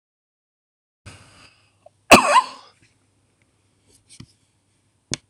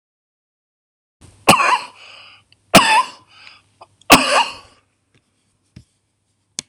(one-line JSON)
{"cough_length": "5.3 s", "cough_amplitude": 26028, "cough_signal_mean_std_ratio": 0.19, "three_cough_length": "6.7 s", "three_cough_amplitude": 26028, "three_cough_signal_mean_std_ratio": 0.3, "survey_phase": "alpha (2021-03-01 to 2021-08-12)", "age": "65+", "gender": "Male", "wearing_mask": "No", "symptom_none": true, "smoker_status": "Ex-smoker", "respiratory_condition_asthma": true, "respiratory_condition_other": false, "recruitment_source": "REACT", "submission_delay": "3 days", "covid_test_result": "Negative", "covid_test_method": "RT-qPCR"}